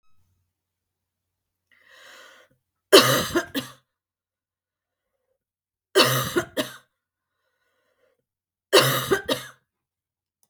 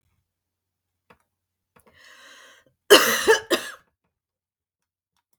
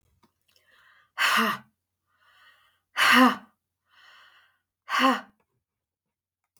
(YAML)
three_cough_length: 10.5 s
three_cough_amplitude: 32768
three_cough_signal_mean_std_ratio: 0.27
cough_length: 5.4 s
cough_amplitude: 32767
cough_signal_mean_std_ratio: 0.23
exhalation_length: 6.6 s
exhalation_amplitude: 18203
exhalation_signal_mean_std_ratio: 0.32
survey_phase: beta (2021-08-13 to 2022-03-07)
age: 45-64
gender: Female
wearing_mask: 'No'
symptom_runny_or_blocked_nose: true
symptom_sore_throat: true
symptom_diarrhoea: true
symptom_headache: true
smoker_status: Current smoker (e-cigarettes or vapes only)
respiratory_condition_asthma: false
respiratory_condition_other: false
recruitment_source: Test and Trace
submission_delay: 1 day
covid_test_result: Negative
covid_test_method: ePCR